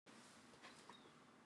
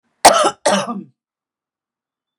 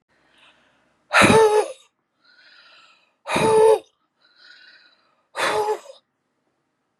{
  "three_cough_length": "1.5 s",
  "three_cough_amplitude": 167,
  "three_cough_signal_mean_std_ratio": 1.06,
  "cough_length": "2.4 s",
  "cough_amplitude": 32768,
  "cough_signal_mean_std_ratio": 0.34,
  "exhalation_length": "7.0 s",
  "exhalation_amplitude": 27732,
  "exhalation_signal_mean_std_ratio": 0.37,
  "survey_phase": "beta (2021-08-13 to 2022-03-07)",
  "age": "45-64",
  "gender": "Female",
  "wearing_mask": "No",
  "symptom_none": true,
  "smoker_status": "Ex-smoker",
  "respiratory_condition_asthma": false,
  "respiratory_condition_other": false,
  "recruitment_source": "REACT",
  "submission_delay": "2 days",
  "covid_test_result": "Negative",
  "covid_test_method": "RT-qPCR",
  "influenza_a_test_result": "Negative",
  "influenza_b_test_result": "Negative"
}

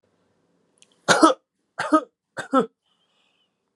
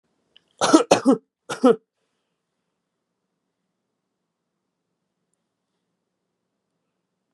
{
  "three_cough_length": "3.8 s",
  "three_cough_amplitude": 30323,
  "three_cough_signal_mean_std_ratio": 0.28,
  "cough_length": "7.3 s",
  "cough_amplitude": 32583,
  "cough_signal_mean_std_ratio": 0.2,
  "survey_phase": "beta (2021-08-13 to 2022-03-07)",
  "age": "18-44",
  "gender": "Male",
  "wearing_mask": "No",
  "symptom_runny_or_blocked_nose": true,
  "smoker_status": "Never smoked",
  "respiratory_condition_asthma": false,
  "respiratory_condition_other": false,
  "recruitment_source": "Test and Trace",
  "submission_delay": "2 days",
  "covid_test_result": "Positive",
  "covid_test_method": "ePCR"
}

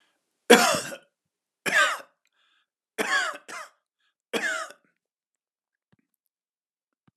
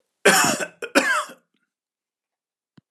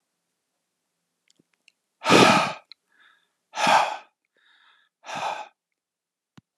{
  "three_cough_length": "7.2 s",
  "three_cough_amplitude": 30219,
  "three_cough_signal_mean_std_ratio": 0.29,
  "cough_length": "2.9 s",
  "cough_amplitude": 32313,
  "cough_signal_mean_std_ratio": 0.38,
  "exhalation_length": "6.6 s",
  "exhalation_amplitude": 26873,
  "exhalation_signal_mean_std_ratio": 0.3,
  "survey_phase": "alpha (2021-03-01 to 2021-08-12)",
  "age": "65+",
  "gender": "Male",
  "wearing_mask": "No",
  "symptom_none": true,
  "smoker_status": "Ex-smoker",
  "respiratory_condition_asthma": false,
  "respiratory_condition_other": false,
  "recruitment_source": "REACT",
  "submission_delay": "2 days",
  "covid_test_result": "Negative",
  "covid_test_method": "RT-qPCR"
}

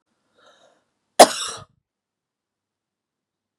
{
  "cough_length": "3.6 s",
  "cough_amplitude": 32768,
  "cough_signal_mean_std_ratio": 0.14,
  "survey_phase": "beta (2021-08-13 to 2022-03-07)",
  "age": "45-64",
  "gender": "Female",
  "wearing_mask": "No",
  "symptom_sore_throat": true,
  "symptom_fatigue": true,
  "symptom_onset": "12 days",
  "smoker_status": "Ex-smoker",
  "respiratory_condition_asthma": true,
  "respiratory_condition_other": false,
  "recruitment_source": "REACT",
  "submission_delay": "1 day",
  "covid_test_result": "Negative",
  "covid_test_method": "RT-qPCR",
  "influenza_a_test_result": "Negative",
  "influenza_b_test_result": "Negative"
}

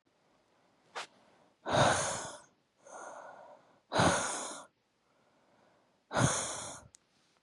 {
  "exhalation_length": "7.4 s",
  "exhalation_amplitude": 7428,
  "exhalation_signal_mean_std_ratio": 0.4,
  "survey_phase": "beta (2021-08-13 to 2022-03-07)",
  "age": "18-44",
  "gender": "Female",
  "wearing_mask": "No",
  "symptom_cough_any": true,
  "symptom_runny_or_blocked_nose": true,
  "symptom_fatigue": true,
  "symptom_onset": "3 days",
  "smoker_status": "Ex-smoker",
  "respiratory_condition_asthma": false,
  "respiratory_condition_other": false,
  "recruitment_source": "REACT",
  "submission_delay": "3 days",
  "covid_test_result": "Negative",
  "covid_test_method": "RT-qPCR"
}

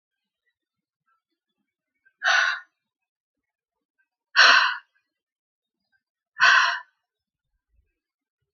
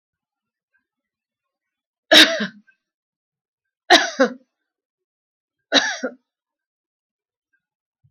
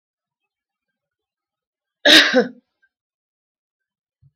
{
  "exhalation_length": "8.5 s",
  "exhalation_amplitude": 24922,
  "exhalation_signal_mean_std_ratio": 0.27,
  "three_cough_length": "8.1 s",
  "three_cough_amplitude": 30864,
  "three_cough_signal_mean_std_ratio": 0.23,
  "cough_length": "4.4 s",
  "cough_amplitude": 30055,
  "cough_signal_mean_std_ratio": 0.23,
  "survey_phase": "beta (2021-08-13 to 2022-03-07)",
  "age": "65+",
  "gender": "Female",
  "wearing_mask": "No",
  "symptom_fatigue": true,
  "symptom_headache": true,
  "smoker_status": "Never smoked",
  "respiratory_condition_asthma": false,
  "respiratory_condition_other": false,
  "recruitment_source": "REACT",
  "submission_delay": "2 days",
  "covid_test_result": "Negative",
  "covid_test_method": "RT-qPCR"
}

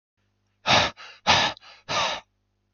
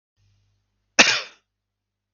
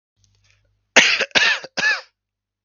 {
  "exhalation_length": "2.7 s",
  "exhalation_amplitude": 21359,
  "exhalation_signal_mean_std_ratio": 0.43,
  "cough_length": "2.1 s",
  "cough_amplitude": 32768,
  "cough_signal_mean_std_ratio": 0.22,
  "three_cough_length": "2.6 s",
  "three_cough_amplitude": 32768,
  "three_cough_signal_mean_std_ratio": 0.4,
  "survey_phase": "beta (2021-08-13 to 2022-03-07)",
  "age": "18-44",
  "gender": "Female",
  "wearing_mask": "No",
  "symptom_cough_any": true,
  "symptom_new_continuous_cough": true,
  "symptom_runny_or_blocked_nose": true,
  "symptom_sore_throat": true,
  "symptom_fever_high_temperature": true,
  "symptom_headache": true,
  "symptom_onset": "2 days",
  "smoker_status": "Never smoked",
  "respiratory_condition_asthma": true,
  "respiratory_condition_other": false,
  "recruitment_source": "Test and Trace",
  "submission_delay": "1 day",
  "covid_test_result": "Positive",
  "covid_test_method": "RT-qPCR",
  "covid_ct_value": 25.0,
  "covid_ct_gene": "ORF1ab gene",
  "covid_ct_mean": 25.4,
  "covid_viral_load": "4600 copies/ml",
  "covid_viral_load_category": "Minimal viral load (< 10K copies/ml)"
}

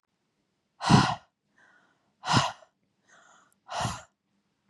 {
  "exhalation_length": "4.7 s",
  "exhalation_amplitude": 15596,
  "exhalation_signal_mean_std_ratio": 0.29,
  "survey_phase": "beta (2021-08-13 to 2022-03-07)",
  "age": "18-44",
  "gender": "Female",
  "wearing_mask": "No",
  "symptom_none": true,
  "symptom_onset": "13 days",
  "smoker_status": "Ex-smoker",
  "respiratory_condition_asthma": false,
  "respiratory_condition_other": false,
  "recruitment_source": "REACT",
  "submission_delay": "5 days",
  "covid_test_result": "Negative",
  "covid_test_method": "RT-qPCR",
  "influenza_a_test_result": "Negative",
  "influenza_b_test_result": "Negative"
}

